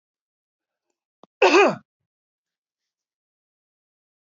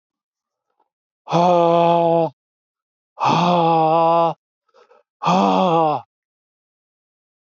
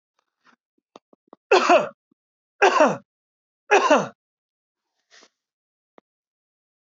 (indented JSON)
{
  "cough_length": "4.3 s",
  "cough_amplitude": 19574,
  "cough_signal_mean_std_ratio": 0.21,
  "exhalation_length": "7.4 s",
  "exhalation_amplitude": 22904,
  "exhalation_signal_mean_std_ratio": 0.52,
  "three_cough_length": "6.9 s",
  "three_cough_amplitude": 24190,
  "three_cough_signal_mean_std_ratio": 0.29,
  "survey_phase": "beta (2021-08-13 to 2022-03-07)",
  "age": "65+",
  "gender": "Male",
  "wearing_mask": "No",
  "symptom_none": true,
  "smoker_status": "Ex-smoker",
  "respiratory_condition_asthma": false,
  "respiratory_condition_other": false,
  "recruitment_source": "REACT",
  "submission_delay": "1 day",
  "covid_test_result": "Negative",
  "covid_test_method": "RT-qPCR"
}